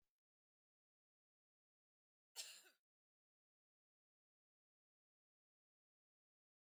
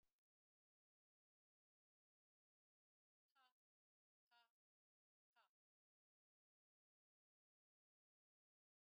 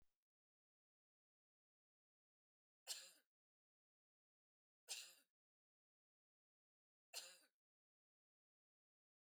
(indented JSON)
{
  "cough_length": "6.7 s",
  "cough_amplitude": 510,
  "cough_signal_mean_std_ratio": 0.14,
  "exhalation_length": "8.9 s",
  "exhalation_amplitude": 21,
  "exhalation_signal_mean_std_ratio": 0.16,
  "three_cough_length": "9.3 s",
  "three_cough_amplitude": 535,
  "three_cough_signal_mean_std_ratio": 0.19,
  "survey_phase": "beta (2021-08-13 to 2022-03-07)",
  "age": "45-64",
  "gender": "Female",
  "wearing_mask": "No",
  "symptom_none": true,
  "symptom_onset": "6 days",
  "smoker_status": "Never smoked",
  "respiratory_condition_asthma": false,
  "respiratory_condition_other": false,
  "recruitment_source": "REACT",
  "submission_delay": "4 days",
  "covid_test_result": "Negative",
  "covid_test_method": "RT-qPCR"
}